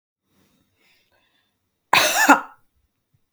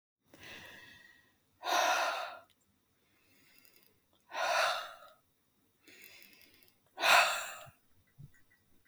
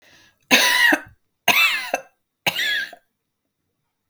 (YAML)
cough_length: 3.3 s
cough_amplitude: 32766
cough_signal_mean_std_ratio: 0.28
exhalation_length: 8.9 s
exhalation_amplitude: 10262
exhalation_signal_mean_std_ratio: 0.36
three_cough_length: 4.1 s
three_cough_amplitude: 30998
three_cough_signal_mean_std_ratio: 0.45
survey_phase: beta (2021-08-13 to 2022-03-07)
age: 45-64
gender: Female
wearing_mask: 'No'
symptom_none: true
smoker_status: Never smoked
respiratory_condition_asthma: false
respiratory_condition_other: false
recruitment_source: REACT
submission_delay: 1 day
covid_test_result: Negative
covid_test_method: RT-qPCR
influenza_a_test_result: Negative
influenza_b_test_result: Negative